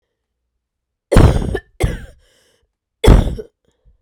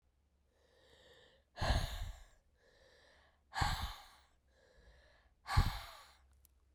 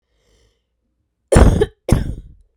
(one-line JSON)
{"three_cough_length": "4.0 s", "three_cough_amplitude": 32768, "three_cough_signal_mean_std_ratio": 0.34, "exhalation_length": "6.7 s", "exhalation_amplitude": 4624, "exhalation_signal_mean_std_ratio": 0.34, "cough_length": "2.6 s", "cough_amplitude": 32768, "cough_signal_mean_std_ratio": 0.35, "survey_phase": "beta (2021-08-13 to 2022-03-07)", "age": "18-44", "gender": "Female", "wearing_mask": "No", "symptom_cough_any": true, "symptom_runny_or_blocked_nose": true, "symptom_sore_throat": true, "symptom_headache": true, "smoker_status": "Ex-smoker", "respiratory_condition_asthma": false, "respiratory_condition_other": false, "recruitment_source": "Test and Trace", "submission_delay": "1 day", "covid_test_result": "Positive", "covid_test_method": "LFT"}